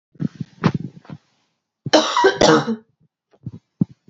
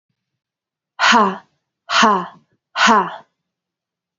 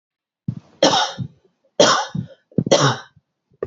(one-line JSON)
{"cough_length": "4.1 s", "cough_amplitude": 28050, "cough_signal_mean_std_ratio": 0.38, "exhalation_length": "4.2 s", "exhalation_amplitude": 29327, "exhalation_signal_mean_std_ratio": 0.4, "three_cough_length": "3.7 s", "three_cough_amplitude": 30251, "three_cough_signal_mean_std_ratio": 0.42, "survey_phase": "beta (2021-08-13 to 2022-03-07)", "age": "18-44", "gender": "Female", "wearing_mask": "No", "symptom_cough_any": true, "symptom_runny_or_blocked_nose": true, "symptom_headache": true, "symptom_onset": "3 days", "smoker_status": "Never smoked", "respiratory_condition_asthma": false, "respiratory_condition_other": false, "recruitment_source": "Test and Trace", "submission_delay": "1 day", "covid_test_result": "Positive", "covid_test_method": "RT-qPCR", "covid_ct_value": 25.1, "covid_ct_gene": "ORF1ab gene"}